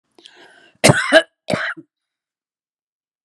{"cough_length": "3.2 s", "cough_amplitude": 32768, "cough_signal_mean_std_ratio": 0.29, "survey_phase": "beta (2021-08-13 to 2022-03-07)", "age": "65+", "gender": "Female", "wearing_mask": "No", "symptom_none": true, "smoker_status": "Never smoked", "respiratory_condition_asthma": false, "respiratory_condition_other": false, "recruitment_source": "REACT", "submission_delay": "1 day", "covid_test_result": "Negative", "covid_test_method": "RT-qPCR"}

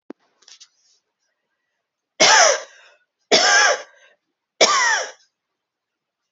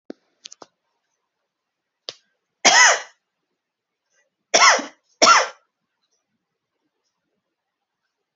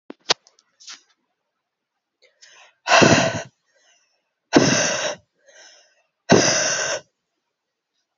{"three_cough_length": "6.3 s", "three_cough_amplitude": 32767, "three_cough_signal_mean_std_ratio": 0.37, "cough_length": "8.4 s", "cough_amplitude": 32768, "cough_signal_mean_std_ratio": 0.25, "exhalation_length": "8.2 s", "exhalation_amplitude": 30142, "exhalation_signal_mean_std_ratio": 0.35, "survey_phase": "alpha (2021-03-01 to 2021-08-12)", "age": "18-44", "gender": "Female", "wearing_mask": "No", "symptom_new_continuous_cough": true, "symptom_fatigue": true, "symptom_headache": true, "symptom_change_to_sense_of_smell_or_taste": true, "symptom_onset": "6 days", "smoker_status": "Current smoker (e-cigarettes or vapes only)", "respiratory_condition_asthma": false, "respiratory_condition_other": false, "recruitment_source": "Test and Trace", "submission_delay": "2 days", "covid_test_result": "Positive", "covid_test_method": "RT-qPCR", "covid_ct_value": 20.5, "covid_ct_gene": "ORF1ab gene", "covid_ct_mean": 20.6, "covid_viral_load": "170000 copies/ml", "covid_viral_load_category": "Low viral load (10K-1M copies/ml)"}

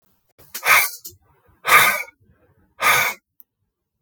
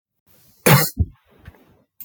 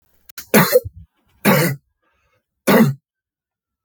{"exhalation_length": "4.0 s", "exhalation_amplitude": 32766, "exhalation_signal_mean_std_ratio": 0.39, "cough_length": "2.0 s", "cough_amplitude": 32766, "cough_signal_mean_std_ratio": 0.3, "three_cough_length": "3.8 s", "three_cough_amplitude": 32766, "three_cough_signal_mean_std_ratio": 0.38, "survey_phase": "beta (2021-08-13 to 2022-03-07)", "age": "45-64", "gender": "Male", "wearing_mask": "No", "symptom_cough_any": true, "symptom_runny_or_blocked_nose": true, "symptom_fatigue": true, "symptom_fever_high_temperature": true, "symptom_headache": true, "symptom_change_to_sense_of_smell_or_taste": true, "symptom_onset": "4 days", "smoker_status": "Ex-smoker", "respiratory_condition_asthma": false, "respiratory_condition_other": false, "recruitment_source": "Test and Trace", "submission_delay": "2 days", "covid_test_result": "Positive", "covid_test_method": "RT-qPCR"}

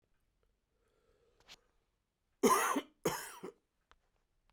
{"cough_length": "4.5 s", "cough_amplitude": 4353, "cough_signal_mean_std_ratio": 0.28, "survey_phase": "beta (2021-08-13 to 2022-03-07)", "age": "45-64", "gender": "Male", "wearing_mask": "No", "symptom_cough_any": true, "symptom_runny_or_blocked_nose": true, "symptom_shortness_of_breath": true, "symptom_sore_throat": true, "symptom_fatigue": true, "symptom_headache": true, "symptom_change_to_sense_of_smell_or_taste": true, "symptom_other": true, "symptom_onset": "4 days", "smoker_status": "Ex-smoker", "respiratory_condition_asthma": false, "respiratory_condition_other": false, "recruitment_source": "Test and Trace", "submission_delay": "2 days", "covid_test_result": "Positive", "covid_test_method": "RT-qPCR", "covid_ct_value": 17.0, "covid_ct_gene": "ORF1ab gene"}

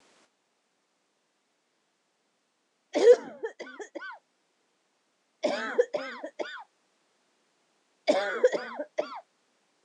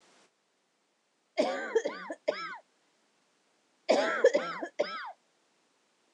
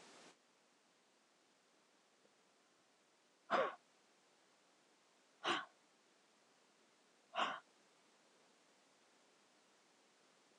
{"three_cough_length": "9.8 s", "three_cough_amplitude": 13288, "three_cough_signal_mean_std_ratio": 0.28, "cough_length": "6.1 s", "cough_amplitude": 9244, "cough_signal_mean_std_ratio": 0.37, "exhalation_length": "10.6 s", "exhalation_amplitude": 1994, "exhalation_signal_mean_std_ratio": 0.24, "survey_phase": "beta (2021-08-13 to 2022-03-07)", "age": "18-44", "gender": "Female", "wearing_mask": "Yes", "symptom_cough_any": true, "symptom_runny_or_blocked_nose": true, "symptom_headache": true, "symptom_change_to_sense_of_smell_or_taste": true, "symptom_loss_of_taste": true, "symptom_other": true, "symptom_onset": "3 days", "smoker_status": "Never smoked", "respiratory_condition_asthma": false, "respiratory_condition_other": false, "recruitment_source": "Test and Trace", "submission_delay": "2 days", "covid_test_result": "Positive", "covid_test_method": "RT-qPCR", "covid_ct_value": 17.9, "covid_ct_gene": "ORF1ab gene", "covid_ct_mean": 18.5, "covid_viral_load": "820000 copies/ml", "covid_viral_load_category": "Low viral load (10K-1M copies/ml)"}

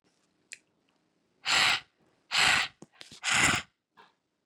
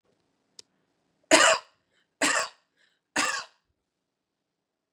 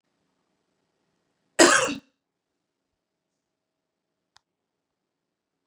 {"exhalation_length": "4.5 s", "exhalation_amplitude": 11951, "exhalation_signal_mean_std_ratio": 0.39, "three_cough_length": "4.9 s", "three_cough_amplitude": 21423, "three_cough_signal_mean_std_ratio": 0.28, "cough_length": "5.7 s", "cough_amplitude": 31122, "cough_signal_mean_std_ratio": 0.17, "survey_phase": "beta (2021-08-13 to 2022-03-07)", "age": "18-44", "gender": "Female", "wearing_mask": "No", "symptom_none": true, "smoker_status": "Never smoked", "respiratory_condition_asthma": false, "respiratory_condition_other": false, "recruitment_source": "REACT", "submission_delay": "4 days", "covid_test_result": "Negative", "covid_test_method": "RT-qPCR", "influenza_a_test_result": "Negative", "influenza_b_test_result": "Negative"}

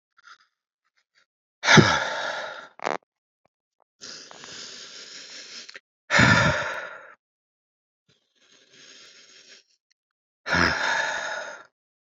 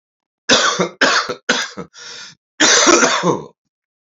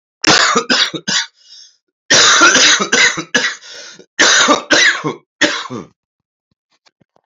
{"exhalation_length": "12.0 s", "exhalation_amplitude": 27554, "exhalation_signal_mean_std_ratio": 0.34, "three_cough_length": "4.0 s", "three_cough_amplitude": 32767, "three_cough_signal_mean_std_ratio": 0.55, "cough_length": "7.3 s", "cough_amplitude": 32768, "cough_signal_mean_std_ratio": 0.57, "survey_phase": "beta (2021-08-13 to 2022-03-07)", "age": "18-44", "gender": "Male", "wearing_mask": "No", "symptom_cough_any": true, "symptom_sore_throat": true, "symptom_abdominal_pain": true, "symptom_headache": true, "symptom_onset": "4 days", "smoker_status": "Current smoker (1 to 10 cigarettes per day)", "respiratory_condition_asthma": false, "respiratory_condition_other": false, "recruitment_source": "Test and Trace", "submission_delay": "2 days", "covid_test_result": "Positive", "covid_test_method": "RT-qPCR", "covid_ct_value": 27.4, "covid_ct_gene": "ORF1ab gene", "covid_ct_mean": 27.6, "covid_viral_load": "870 copies/ml", "covid_viral_load_category": "Minimal viral load (< 10K copies/ml)"}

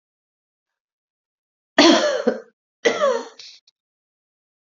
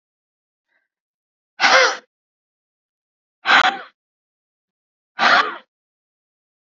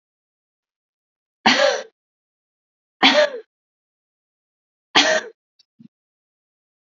{"cough_length": "4.6 s", "cough_amplitude": 29575, "cough_signal_mean_std_ratio": 0.33, "exhalation_length": "6.7 s", "exhalation_amplitude": 32767, "exhalation_signal_mean_std_ratio": 0.29, "three_cough_length": "6.8 s", "three_cough_amplitude": 32025, "three_cough_signal_mean_std_ratio": 0.28, "survey_phase": "alpha (2021-03-01 to 2021-08-12)", "age": "18-44", "gender": "Female", "wearing_mask": "No", "symptom_none": true, "smoker_status": "Current smoker (1 to 10 cigarettes per day)", "respiratory_condition_asthma": false, "respiratory_condition_other": false, "recruitment_source": "REACT", "submission_delay": "1 day", "covid_test_result": "Negative", "covid_test_method": "RT-qPCR"}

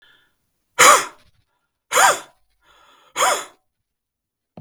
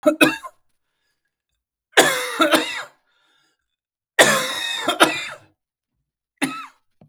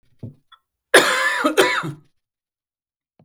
{"exhalation_length": "4.6 s", "exhalation_amplitude": 32768, "exhalation_signal_mean_std_ratio": 0.3, "three_cough_length": "7.1 s", "three_cough_amplitude": 32768, "three_cough_signal_mean_std_ratio": 0.38, "cough_length": "3.2 s", "cough_amplitude": 32768, "cough_signal_mean_std_ratio": 0.4, "survey_phase": "beta (2021-08-13 to 2022-03-07)", "age": "45-64", "gender": "Male", "wearing_mask": "No", "symptom_cough_any": true, "symptom_runny_or_blocked_nose": true, "symptom_sore_throat": true, "symptom_onset": "12 days", "smoker_status": "Never smoked", "respiratory_condition_asthma": false, "respiratory_condition_other": false, "recruitment_source": "REACT", "submission_delay": "1 day", "covid_test_result": "Negative", "covid_test_method": "RT-qPCR", "influenza_a_test_result": "Negative", "influenza_b_test_result": "Negative"}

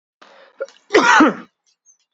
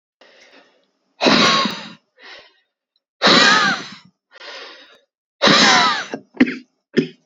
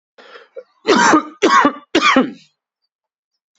{"cough_length": "2.1 s", "cough_amplitude": 32768, "cough_signal_mean_std_ratio": 0.38, "exhalation_length": "7.3 s", "exhalation_amplitude": 32767, "exhalation_signal_mean_std_ratio": 0.44, "three_cough_length": "3.6 s", "three_cough_amplitude": 32767, "three_cough_signal_mean_std_ratio": 0.45, "survey_phase": "beta (2021-08-13 to 2022-03-07)", "age": "18-44", "gender": "Male", "wearing_mask": "No", "symptom_cough_any": true, "symptom_runny_or_blocked_nose": true, "symptom_sore_throat": true, "symptom_fatigue": true, "symptom_headache": true, "symptom_onset": "3 days", "smoker_status": "Ex-smoker", "recruitment_source": "Test and Trace", "submission_delay": "2 days", "covid_test_result": "Positive", "covid_test_method": "RT-qPCR", "covid_ct_value": 21.4, "covid_ct_gene": "ORF1ab gene", "covid_ct_mean": 22.1, "covid_viral_load": "58000 copies/ml", "covid_viral_load_category": "Low viral load (10K-1M copies/ml)"}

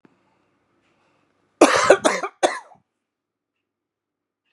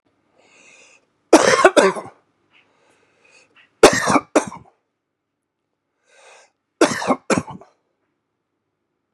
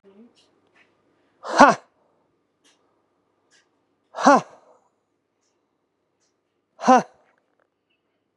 {"cough_length": "4.5 s", "cough_amplitude": 32768, "cough_signal_mean_std_ratio": 0.26, "three_cough_length": "9.1 s", "three_cough_amplitude": 32768, "three_cough_signal_mean_std_ratio": 0.28, "exhalation_length": "8.4 s", "exhalation_amplitude": 32767, "exhalation_signal_mean_std_ratio": 0.2, "survey_phase": "beta (2021-08-13 to 2022-03-07)", "age": "45-64", "gender": "Male", "wearing_mask": "No", "symptom_none": true, "smoker_status": "Ex-smoker", "respiratory_condition_asthma": false, "respiratory_condition_other": false, "recruitment_source": "REACT", "submission_delay": "1 day", "covid_test_result": "Negative", "covid_test_method": "RT-qPCR", "influenza_a_test_result": "Unknown/Void", "influenza_b_test_result": "Unknown/Void"}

